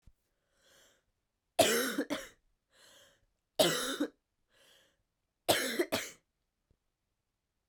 {
  "three_cough_length": "7.7 s",
  "three_cough_amplitude": 10040,
  "three_cough_signal_mean_std_ratio": 0.33,
  "survey_phase": "beta (2021-08-13 to 2022-03-07)",
  "age": "18-44",
  "gender": "Female",
  "wearing_mask": "No",
  "symptom_runny_or_blocked_nose": true,
  "symptom_fatigue": true,
  "symptom_headache": true,
  "symptom_change_to_sense_of_smell_or_taste": true,
  "symptom_loss_of_taste": true,
  "smoker_status": "Never smoked",
  "respiratory_condition_asthma": true,
  "respiratory_condition_other": false,
  "recruitment_source": "Test and Trace",
  "submission_delay": "2 days",
  "covid_test_result": "Positive",
  "covid_test_method": "RT-qPCR",
  "covid_ct_value": 8.0,
  "covid_ct_gene": "N gene"
}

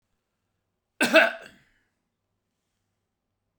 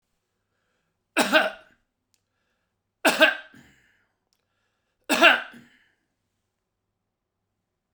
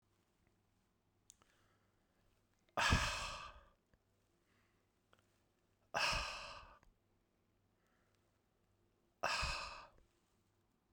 {
  "cough_length": "3.6 s",
  "cough_amplitude": 21443,
  "cough_signal_mean_std_ratio": 0.21,
  "three_cough_length": "7.9 s",
  "three_cough_amplitude": 28575,
  "three_cough_signal_mean_std_ratio": 0.25,
  "exhalation_length": "10.9 s",
  "exhalation_amplitude": 3466,
  "exhalation_signal_mean_std_ratio": 0.31,
  "survey_phase": "beta (2021-08-13 to 2022-03-07)",
  "age": "45-64",
  "gender": "Male",
  "wearing_mask": "No",
  "symptom_none": true,
  "smoker_status": "Never smoked",
  "respiratory_condition_asthma": false,
  "respiratory_condition_other": false,
  "recruitment_source": "REACT",
  "submission_delay": "2 days",
  "covid_test_result": "Negative",
  "covid_test_method": "RT-qPCR"
}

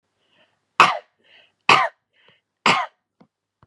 {
  "three_cough_length": "3.7 s",
  "three_cough_amplitude": 32768,
  "three_cough_signal_mean_std_ratio": 0.28,
  "survey_phase": "beta (2021-08-13 to 2022-03-07)",
  "age": "18-44",
  "gender": "Female",
  "wearing_mask": "No",
  "symptom_none": true,
  "symptom_onset": "12 days",
  "smoker_status": "Never smoked",
  "respiratory_condition_asthma": false,
  "respiratory_condition_other": false,
  "recruitment_source": "REACT",
  "submission_delay": "1 day",
  "covid_test_result": "Negative",
  "covid_test_method": "RT-qPCR",
  "influenza_a_test_result": "Negative",
  "influenza_b_test_result": "Negative"
}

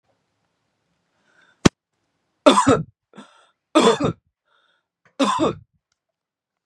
{
  "three_cough_length": "6.7 s",
  "three_cough_amplitude": 32768,
  "three_cough_signal_mean_std_ratio": 0.29,
  "survey_phase": "beta (2021-08-13 to 2022-03-07)",
  "age": "18-44",
  "gender": "Male",
  "wearing_mask": "No",
  "symptom_fever_high_temperature": true,
  "symptom_onset": "4 days",
  "smoker_status": "Never smoked",
  "respiratory_condition_asthma": false,
  "respiratory_condition_other": false,
  "recruitment_source": "Test and Trace",
  "submission_delay": "3 days",
  "covid_test_result": "Negative",
  "covid_test_method": "RT-qPCR"
}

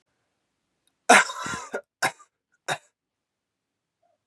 {
  "cough_length": "4.3 s",
  "cough_amplitude": 26975,
  "cough_signal_mean_std_ratio": 0.23,
  "survey_phase": "beta (2021-08-13 to 2022-03-07)",
  "age": "18-44",
  "gender": "Male",
  "wearing_mask": "No",
  "symptom_runny_or_blocked_nose": true,
  "symptom_loss_of_taste": true,
  "symptom_other": true,
  "smoker_status": "Never smoked",
  "respiratory_condition_asthma": false,
  "respiratory_condition_other": false,
  "recruitment_source": "Test and Trace",
  "submission_delay": "1 day",
  "covid_test_result": "Positive",
  "covid_test_method": "RT-qPCR",
  "covid_ct_value": 18.9,
  "covid_ct_gene": "ORF1ab gene"
}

